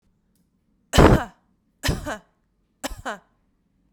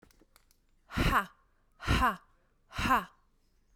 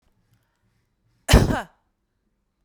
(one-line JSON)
{"three_cough_length": "3.9 s", "three_cough_amplitude": 32767, "three_cough_signal_mean_std_ratio": 0.27, "exhalation_length": "3.8 s", "exhalation_amplitude": 6645, "exhalation_signal_mean_std_ratio": 0.4, "cough_length": "2.6 s", "cough_amplitude": 32686, "cough_signal_mean_std_ratio": 0.23, "survey_phase": "beta (2021-08-13 to 2022-03-07)", "age": "18-44", "gender": "Female", "wearing_mask": "No", "symptom_none": true, "smoker_status": "Never smoked", "respiratory_condition_asthma": false, "respiratory_condition_other": false, "recruitment_source": "REACT", "submission_delay": "2 days", "covid_test_result": "Negative", "covid_test_method": "RT-qPCR"}